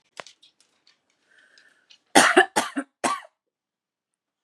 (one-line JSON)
{"cough_length": "4.4 s", "cough_amplitude": 31347, "cough_signal_mean_std_ratio": 0.25, "survey_phase": "beta (2021-08-13 to 2022-03-07)", "age": "18-44", "gender": "Female", "wearing_mask": "No", "symptom_cough_any": true, "symptom_runny_or_blocked_nose": true, "symptom_sore_throat": true, "symptom_fatigue": true, "symptom_onset": "12 days", "smoker_status": "Ex-smoker", "respiratory_condition_asthma": true, "respiratory_condition_other": false, "recruitment_source": "REACT", "submission_delay": "0 days", "covid_test_result": "Negative", "covid_test_method": "RT-qPCR", "influenza_a_test_result": "Negative", "influenza_b_test_result": "Negative"}